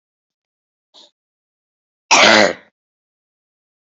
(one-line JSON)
{"cough_length": "3.9 s", "cough_amplitude": 31450, "cough_signal_mean_std_ratio": 0.26, "survey_phase": "beta (2021-08-13 to 2022-03-07)", "age": "18-44", "gender": "Female", "wearing_mask": "No", "symptom_cough_any": true, "symptom_sore_throat": true, "symptom_fatigue": true, "symptom_fever_high_temperature": true, "symptom_other": true, "symptom_onset": "3 days", "smoker_status": "Never smoked", "respiratory_condition_asthma": false, "respiratory_condition_other": false, "recruitment_source": "Test and Trace", "submission_delay": "2 days", "covid_test_result": "Positive", "covid_test_method": "RT-qPCR", "covid_ct_value": 17.5, "covid_ct_gene": "ORF1ab gene", "covid_ct_mean": 17.9, "covid_viral_load": "1400000 copies/ml", "covid_viral_load_category": "High viral load (>1M copies/ml)"}